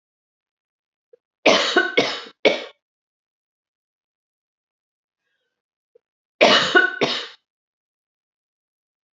{"cough_length": "9.1 s", "cough_amplitude": 27970, "cough_signal_mean_std_ratio": 0.3, "survey_phase": "beta (2021-08-13 to 2022-03-07)", "age": "45-64", "gender": "Female", "wearing_mask": "No", "symptom_none": true, "smoker_status": "Never smoked", "respiratory_condition_asthma": false, "respiratory_condition_other": false, "recruitment_source": "REACT", "submission_delay": "1 day", "covid_test_result": "Negative", "covid_test_method": "RT-qPCR", "influenza_a_test_result": "Negative", "influenza_b_test_result": "Negative"}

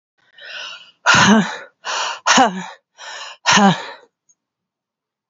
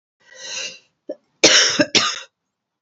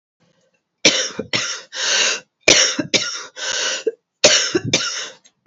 {"exhalation_length": "5.3 s", "exhalation_amplitude": 32541, "exhalation_signal_mean_std_ratio": 0.44, "cough_length": "2.8 s", "cough_amplitude": 32670, "cough_signal_mean_std_ratio": 0.4, "three_cough_length": "5.5 s", "three_cough_amplitude": 32768, "three_cough_signal_mean_std_ratio": 0.53, "survey_phase": "beta (2021-08-13 to 2022-03-07)", "age": "45-64", "gender": "Female", "wearing_mask": "No", "symptom_cough_any": true, "symptom_runny_or_blocked_nose": true, "symptom_fatigue": true, "symptom_headache": true, "smoker_status": "Never smoked", "respiratory_condition_asthma": false, "respiratory_condition_other": false, "recruitment_source": "Test and Trace", "submission_delay": "2 days", "covid_test_result": "Positive", "covid_test_method": "ePCR"}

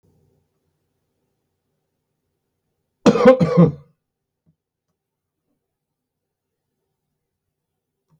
{"cough_length": "8.2 s", "cough_amplitude": 28294, "cough_signal_mean_std_ratio": 0.2, "survey_phase": "beta (2021-08-13 to 2022-03-07)", "age": "65+", "gender": "Male", "wearing_mask": "No", "symptom_headache": true, "symptom_onset": "12 days", "smoker_status": "Ex-smoker", "respiratory_condition_asthma": false, "respiratory_condition_other": false, "recruitment_source": "REACT", "submission_delay": "3 days", "covid_test_result": "Negative", "covid_test_method": "RT-qPCR"}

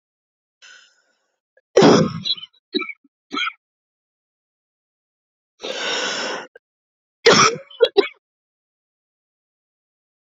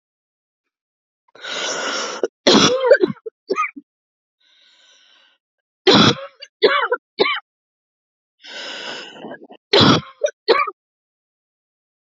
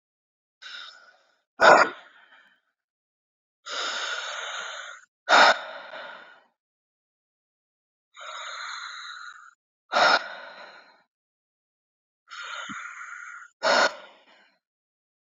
{"cough_length": "10.3 s", "cough_amplitude": 32499, "cough_signal_mean_std_ratio": 0.29, "three_cough_length": "12.1 s", "three_cough_amplitude": 32768, "three_cough_signal_mean_std_ratio": 0.37, "exhalation_length": "15.3 s", "exhalation_amplitude": 24207, "exhalation_signal_mean_std_ratio": 0.3, "survey_phase": "beta (2021-08-13 to 2022-03-07)", "age": "45-64", "gender": "Female", "wearing_mask": "No", "symptom_cough_any": true, "symptom_runny_or_blocked_nose": true, "symptom_sore_throat": true, "symptom_headache": true, "symptom_change_to_sense_of_smell_or_taste": true, "symptom_loss_of_taste": true, "smoker_status": "Ex-smoker", "respiratory_condition_asthma": true, "respiratory_condition_other": false, "recruitment_source": "Test and Trace", "submission_delay": "2 days", "covid_test_result": "Positive", "covid_test_method": "ePCR"}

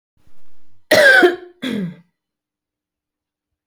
{"cough_length": "3.7 s", "cough_amplitude": 32768, "cough_signal_mean_std_ratio": 0.39, "survey_phase": "beta (2021-08-13 to 2022-03-07)", "age": "45-64", "gender": "Female", "wearing_mask": "No", "symptom_none": true, "smoker_status": "Current smoker (1 to 10 cigarettes per day)", "respiratory_condition_asthma": false, "respiratory_condition_other": false, "recruitment_source": "REACT", "submission_delay": "5 days", "covid_test_result": "Negative", "covid_test_method": "RT-qPCR"}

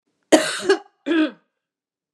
{"cough_length": "2.1 s", "cough_amplitude": 32746, "cough_signal_mean_std_ratio": 0.39, "survey_phase": "beta (2021-08-13 to 2022-03-07)", "age": "65+", "gender": "Female", "wearing_mask": "No", "symptom_cough_any": true, "smoker_status": "Ex-smoker", "respiratory_condition_asthma": false, "respiratory_condition_other": false, "recruitment_source": "REACT", "submission_delay": "2 days", "covid_test_result": "Negative", "covid_test_method": "RT-qPCR", "influenza_a_test_result": "Negative", "influenza_b_test_result": "Negative"}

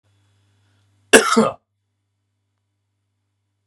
{"cough_length": "3.7 s", "cough_amplitude": 32768, "cough_signal_mean_std_ratio": 0.22, "survey_phase": "beta (2021-08-13 to 2022-03-07)", "age": "45-64", "gender": "Male", "wearing_mask": "No", "symptom_sore_throat": true, "smoker_status": "Never smoked", "respiratory_condition_asthma": false, "respiratory_condition_other": false, "recruitment_source": "Test and Trace", "submission_delay": "1 day", "covid_test_result": "Positive", "covid_test_method": "RT-qPCR", "covid_ct_value": 31.1, "covid_ct_gene": "ORF1ab gene", "covid_ct_mean": 31.1, "covid_viral_load": "61 copies/ml", "covid_viral_load_category": "Minimal viral load (< 10K copies/ml)"}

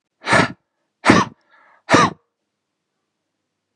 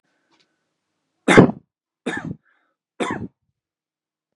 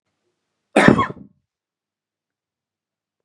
{"exhalation_length": "3.8 s", "exhalation_amplitude": 32768, "exhalation_signal_mean_std_ratio": 0.32, "three_cough_length": "4.4 s", "three_cough_amplitude": 32768, "three_cough_signal_mean_std_ratio": 0.23, "cough_length": "3.2 s", "cough_amplitude": 32768, "cough_signal_mean_std_ratio": 0.22, "survey_phase": "beta (2021-08-13 to 2022-03-07)", "age": "18-44", "gender": "Male", "wearing_mask": "No", "symptom_shortness_of_breath": true, "symptom_onset": "11 days", "smoker_status": "Ex-smoker", "respiratory_condition_asthma": false, "respiratory_condition_other": false, "recruitment_source": "REACT", "submission_delay": "3 days", "covid_test_result": "Negative", "covid_test_method": "RT-qPCR", "influenza_a_test_result": "Negative", "influenza_b_test_result": "Negative"}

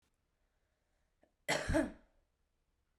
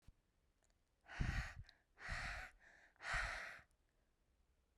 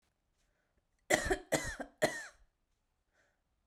{"cough_length": "3.0 s", "cough_amplitude": 3117, "cough_signal_mean_std_ratio": 0.29, "exhalation_length": "4.8 s", "exhalation_amplitude": 1581, "exhalation_signal_mean_std_ratio": 0.45, "three_cough_length": "3.7 s", "three_cough_amplitude": 9590, "three_cough_signal_mean_std_ratio": 0.31, "survey_phase": "beta (2021-08-13 to 2022-03-07)", "age": "18-44", "gender": "Female", "wearing_mask": "No", "symptom_change_to_sense_of_smell_or_taste": true, "symptom_onset": "3 days", "smoker_status": "Current smoker (11 or more cigarettes per day)", "respiratory_condition_asthma": false, "respiratory_condition_other": false, "recruitment_source": "Test and Trace", "submission_delay": "2 days", "covid_test_result": "Positive", "covid_test_method": "RT-qPCR", "covid_ct_value": 17.2, "covid_ct_gene": "ORF1ab gene", "covid_ct_mean": 17.8, "covid_viral_load": "1400000 copies/ml", "covid_viral_load_category": "High viral load (>1M copies/ml)"}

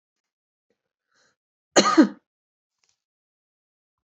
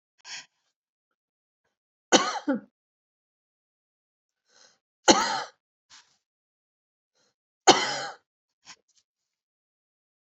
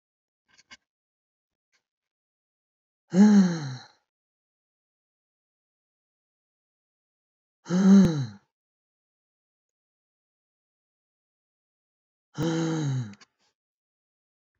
{"cough_length": "4.1 s", "cough_amplitude": 28164, "cough_signal_mean_std_ratio": 0.2, "three_cough_length": "10.3 s", "three_cough_amplitude": 29713, "three_cough_signal_mean_std_ratio": 0.21, "exhalation_length": "14.6 s", "exhalation_amplitude": 13347, "exhalation_signal_mean_std_ratio": 0.26, "survey_phase": "beta (2021-08-13 to 2022-03-07)", "age": "65+", "gender": "Female", "wearing_mask": "No", "symptom_none": true, "smoker_status": "Ex-smoker", "respiratory_condition_asthma": false, "respiratory_condition_other": false, "recruitment_source": "REACT", "submission_delay": "3 days", "covid_test_result": "Negative", "covid_test_method": "RT-qPCR", "influenza_a_test_result": "Negative", "influenza_b_test_result": "Negative"}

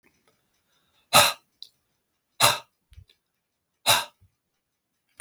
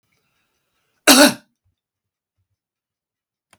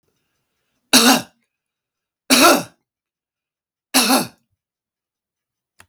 {"exhalation_length": "5.2 s", "exhalation_amplitude": 32768, "exhalation_signal_mean_std_ratio": 0.24, "cough_length": "3.6 s", "cough_amplitude": 32768, "cough_signal_mean_std_ratio": 0.21, "three_cough_length": "5.9 s", "three_cough_amplitude": 32768, "three_cough_signal_mean_std_ratio": 0.31, "survey_phase": "beta (2021-08-13 to 2022-03-07)", "age": "65+", "gender": "Male", "wearing_mask": "No", "symptom_runny_or_blocked_nose": true, "smoker_status": "Never smoked", "respiratory_condition_asthma": false, "respiratory_condition_other": false, "recruitment_source": "Test and Trace", "submission_delay": "2 days", "covid_test_result": "Positive", "covid_test_method": "RT-qPCR"}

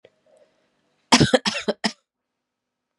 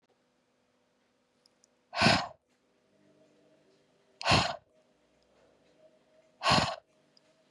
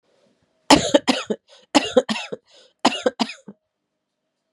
{"cough_length": "3.0 s", "cough_amplitude": 32423, "cough_signal_mean_std_ratio": 0.27, "exhalation_length": "7.5 s", "exhalation_amplitude": 11337, "exhalation_signal_mean_std_ratio": 0.27, "three_cough_length": "4.5 s", "three_cough_amplitude": 32768, "three_cough_signal_mean_std_ratio": 0.31, "survey_phase": "beta (2021-08-13 to 2022-03-07)", "age": "18-44", "gender": "Female", "wearing_mask": "No", "symptom_runny_or_blocked_nose": true, "symptom_abdominal_pain": true, "symptom_fatigue": true, "symptom_headache": true, "smoker_status": "Never smoked", "respiratory_condition_asthma": false, "respiratory_condition_other": false, "recruitment_source": "Test and Trace", "submission_delay": "1 day", "covid_test_result": "Positive", "covid_test_method": "LFT"}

